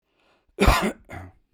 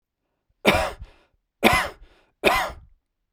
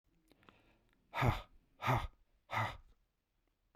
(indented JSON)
{
  "cough_length": "1.5 s",
  "cough_amplitude": 21967,
  "cough_signal_mean_std_ratio": 0.37,
  "three_cough_length": "3.3 s",
  "three_cough_amplitude": 32767,
  "three_cough_signal_mean_std_ratio": 0.38,
  "exhalation_length": "3.8 s",
  "exhalation_amplitude": 3654,
  "exhalation_signal_mean_std_ratio": 0.35,
  "survey_phase": "beta (2021-08-13 to 2022-03-07)",
  "age": "45-64",
  "gender": "Male",
  "wearing_mask": "No",
  "symptom_none": true,
  "smoker_status": "Current smoker (e-cigarettes or vapes only)",
  "respiratory_condition_asthma": false,
  "respiratory_condition_other": false,
  "recruitment_source": "REACT",
  "submission_delay": "0 days",
  "covid_test_result": "Negative",
  "covid_test_method": "RT-qPCR"
}